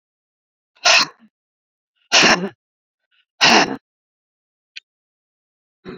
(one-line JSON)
{"exhalation_length": "6.0 s", "exhalation_amplitude": 32548, "exhalation_signal_mean_std_ratio": 0.3, "survey_phase": "beta (2021-08-13 to 2022-03-07)", "age": "45-64", "gender": "Female", "wearing_mask": "No", "symptom_none": true, "smoker_status": "Never smoked", "respiratory_condition_asthma": true, "respiratory_condition_other": false, "recruitment_source": "REACT", "submission_delay": "2 days", "covid_test_result": "Negative", "covid_test_method": "RT-qPCR"}